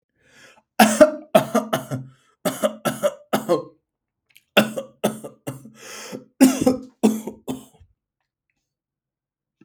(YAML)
three_cough_length: 9.6 s
three_cough_amplitude: 32768
three_cough_signal_mean_std_ratio: 0.35
survey_phase: beta (2021-08-13 to 2022-03-07)
age: 18-44
gender: Male
wearing_mask: 'No'
symptom_none: true
smoker_status: Never smoked
respiratory_condition_asthma: false
respiratory_condition_other: false
recruitment_source: REACT
submission_delay: 4 days
covid_test_result: Negative
covid_test_method: RT-qPCR
influenza_a_test_result: Negative
influenza_b_test_result: Negative